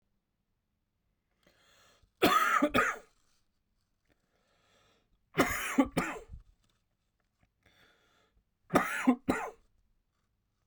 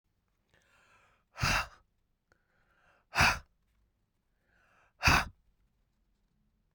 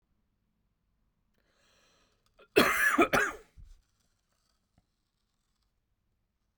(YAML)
three_cough_length: 10.7 s
three_cough_amplitude: 9518
three_cough_signal_mean_std_ratio: 0.32
exhalation_length: 6.7 s
exhalation_amplitude: 8994
exhalation_signal_mean_std_ratio: 0.25
cough_length: 6.6 s
cough_amplitude: 11937
cough_signal_mean_std_ratio: 0.26
survey_phase: beta (2021-08-13 to 2022-03-07)
age: 45-64
gender: Male
wearing_mask: 'Yes'
symptom_change_to_sense_of_smell_or_taste: true
symptom_loss_of_taste: true
symptom_onset: 3 days
smoker_status: Never smoked
respiratory_condition_asthma: false
respiratory_condition_other: false
recruitment_source: Test and Trace
submission_delay: 2 days
covid_test_result: Positive
covid_test_method: RT-qPCR
covid_ct_value: 24.0
covid_ct_gene: ORF1ab gene